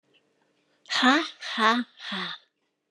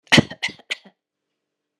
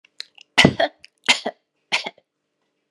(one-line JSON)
{"exhalation_length": "2.9 s", "exhalation_amplitude": 15851, "exhalation_signal_mean_std_ratio": 0.42, "cough_length": "1.8 s", "cough_amplitude": 31113, "cough_signal_mean_std_ratio": 0.23, "three_cough_length": "2.9 s", "three_cough_amplitude": 32768, "three_cough_signal_mean_std_ratio": 0.28, "survey_phase": "beta (2021-08-13 to 2022-03-07)", "age": "65+", "gender": "Female", "wearing_mask": "No", "symptom_none": true, "smoker_status": "Never smoked", "respiratory_condition_asthma": false, "respiratory_condition_other": false, "recruitment_source": "REACT", "submission_delay": "2 days", "covid_test_result": "Negative", "covid_test_method": "RT-qPCR"}